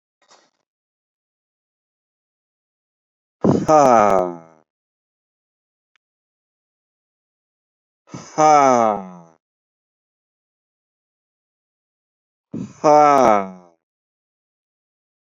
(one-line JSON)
{"exhalation_length": "15.4 s", "exhalation_amplitude": 29595, "exhalation_signal_mean_std_ratio": 0.28, "survey_phase": "beta (2021-08-13 to 2022-03-07)", "age": "45-64", "gender": "Male", "wearing_mask": "No", "symptom_shortness_of_breath": true, "symptom_headache": true, "symptom_onset": "12 days", "smoker_status": "Never smoked", "respiratory_condition_asthma": false, "respiratory_condition_other": false, "recruitment_source": "REACT", "submission_delay": "3 days", "covid_test_result": "Negative", "covid_test_method": "RT-qPCR", "influenza_a_test_result": "Negative", "influenza_b_test_result": "Negative"}